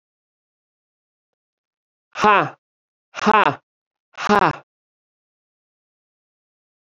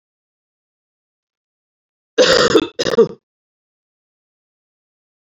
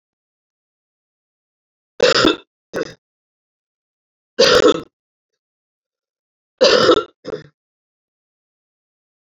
{
  "exhalation_length": "7.0 s",
  "exhalation_amplitude": 29622,
  "exhalation_signal_mean_std_ratio": 0.24,
  "cough_length": "5.2 s",
  "cough_amplitude": 30653,
  "cough_signal_mean_std_ratio": 0.28,
  "three_cough_length": "9.4 s",
  "three_cough_amplitude": 31124,
  "three_cough_signal_mean_std_ratio": 0.28,
  "survey_phase": "beta (2021-08-13 to 2022-03-07)",
  "age": "65+",
  "gender": "Female",
  "wearing_mask": "No",
  "symptom_cough_any": true,
  "symptom_sore_throat": true,
  "symptom_other": true,
  "smoker_status": "Never smoked",
  "respiratory_condition_asthma": false,
  "respiratory_condition_other": false,
  "recruitment_source": "Test and Trace",
  "submission_delay": "1 day",
  "covid_test_result": "Negative",
  "covid_test_method": "RT-qPCR"
}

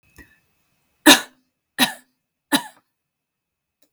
{
  "three_cough_length": "3.9 s",
  "three_cough_amplitude": 32768,
  "three_cough_signal_mean_std_ratio": 0.2,
  "survey_phase": "beta (2021-08-13 to 2022-03-07)",
  "age": "45-64",
  "gender": "Female",
  "wearing_mask": "No",
  "symptom_none": true,
  "smoker_status": "Ex-smoker",
  "respiratory_condition_asthma": false,
  "respiratory_condition_other": false,
  "recruitment_source": "REACT",
  "submission_delay": "1 day",
  "covid_test_result": "Negative",
  "covid_test_method": "RT-qPCR"
}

